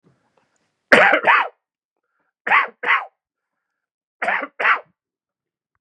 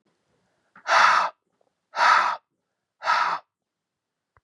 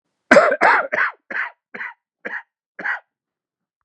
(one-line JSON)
{"three_cough_length": "5.8 s", "three_cough_amplitude": 32768, "three_cough_signal_mean_std_ratio": 0.35, "exhalation_length": "4.4 s", "exhalation_amplitude": 22627, "exhalation_signal_mean_std_ratio": 0.41, "cough_length": "3.8 s", "cough_amplitude": 32768, "cough_signal_mean_std_ratio": 0.38, "survey_phase": "beta (2021-08-13 to 2022-03-07)", "age": "45-64", "gender": "Male", "wearing_mask": "No", "symptom_cough_any": true, "smoker_status": "Never smoked", "respiratory_condition_asthma": false, "respiratory_condition_other": false, "recruitment_source": "Test and Trace", "submission_delay": "1 day", "covid_test_result": "Positive", "covid_test_method": "RT-qPCR", "covid_ct_value": 21.0, "covid_ct_gene": "ORF1ab gene", "covid_ct_mean": 21.5, "covid_viral_load": "91000 copies/ml", "covid_viral_load_category": "Low viral load (10K-1M copies/ml)"}